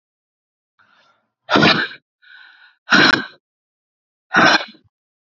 {"exhalation_length": "5.3 s", "exhalation_amplitude": 32768, "exhalation_signal_mean_std_ratio": 0.34, "survey_phase": "beta (2021-08-13 to 2022-03-07)", "age": "18-44", "gender": "Female", "wearing_mask": "No", "symptom_new_continuous_cough": true, "symptom_runny_or_blocked_nose": true, "symptom_shortness_of_breath": true, "symptom_diarrhoea": true, "symptom_fatigue": true, "symptom_fever_high_temperature": true, "symptom_headache": true, "symptom_change_to_sense_of_smell_or_taste": true, "symptom_loss_of_taste": true, "symptom_onset": "3 days", "smoker_status": "Ex-smoker", "respiratory_condition_asthma": false, "respiratory_condition_other": false, "recruitment_source": "Test and Trace", "submission_delay": "2 days", "covid_test_result": "Positive", "covid_test_method": "RT-qPCR", "covid_ct_value": 21.1, "covid_ct_gene": "ORF1ab gene"}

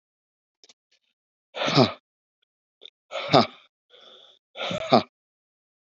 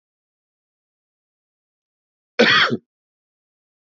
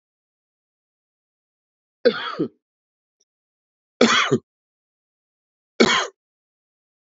{"exhalation_length": "5.9 s", "exhalation_amplitude": 26481, "exhalation_signal_mean_std_ratio": 0.26, "cough_length": "3.8 s", "cough_amplitude": 26459, "cough_signal_mean_std_ratio": 0.24, "three_cough_length": "7.2 s", "three_cough_amplitude": 27553, "three_cough_signal_mean_std_ratio": 0.26, "survey_phase": "beta (2021-08-13 to 2022-03-07)", "age": "45-64", "gender": "Male", "wearing_mask": "No", "symptom_runny_or_blocked_nose": true, "symptom_sore_throat": true, "symptom_onset": "3 days", "smoker_status": "Never smoked", "respiratory_condition_asthma": false, "respiratory_condition_other": false, "recruitment_source": "Test and Trace", "submission_delay": "1 day", "covid_test_result": "Positive", "covid_test_method": "RT-qPCR", "covid_ct_value": 22.5, "covid_ct_gene": "N gene"}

